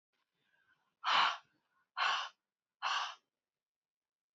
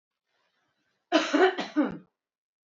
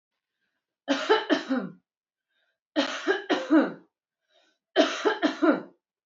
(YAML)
exhalation_length: 4.4 s
exhalation_amplitude: 3939
exhalation_signal_mean_std_ratio: 0.35
cough_length: 2.6 s
cough_amplitude: 14409
cough_signal_mean_std_ratio: 0.37
three_cough_length: 6.1 s
three_cough_amplitude: 15361
three_cough_signal_mean_std_ratio: 0.45
survey_phase: beta (2021-08-13 to 2022-03-07)
age: 45-64
gender: Female
wearing_mask: 'No'
symptom_none: true
symptom_onset: 12 days
smoker_status: Never smoked
respiratory_condition_asthma: false
respiratory_condition_other: false
recruitment_source: REACT
submission_delay: 2 days
covid_test_result: Negative
covid_test_method: RT-qPCR
influenza_a_test_result: Negative
influenza_b_test_result: Negative